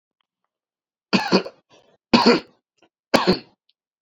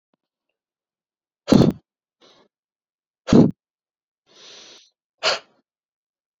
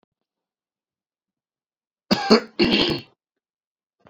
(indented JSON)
{
  "three_cough_length": "4.0 s",
  "three_cough_amplitude": 32768,
  "three_cough_signal_mean_std_ratio": 0.32,
  "exhalation_length": "6.4 s",
  "exhalation_amplitude": 27307,
  "exhalation_signal_mean_std_ratio": 0.22,
  "cough_length": "4.1 s",
  "cough_amplitude": 28925,
  "cough_signal_mean_std_ratio": 0.3,
  "survey_phase": "alpha (2021-03-01 to 2021-08-12)",
  "age": "18-44",
  "gender": "Male",
  "wearing_mask": "No",
  "symptom_cough_any": true,
  "symptom_fever_high_temperature": true,
  "symptom_headache": true,
  "symptom_onset": "2 days",
  "smoker_status": "Ex-smoker",
  "respiratory_condition_asthma": false,
  "respiratory_condition_other": false,
  "recruitment_source": "Test and Trace",
  "submission_delay": "1 day",
  "covid_test_result": "Positive",
  "covid_test_method": "RT-qPCR",
  "covid_ct_value": 13.8,
  "covid_ct_gene": "ORF1ab gene",
  "covid_ct_mean": 14.2,
  "covid_viral_load": "21000000 copies/ml",
  "covid_viral_load_category": "High viral load (>1M copies/ml)"
}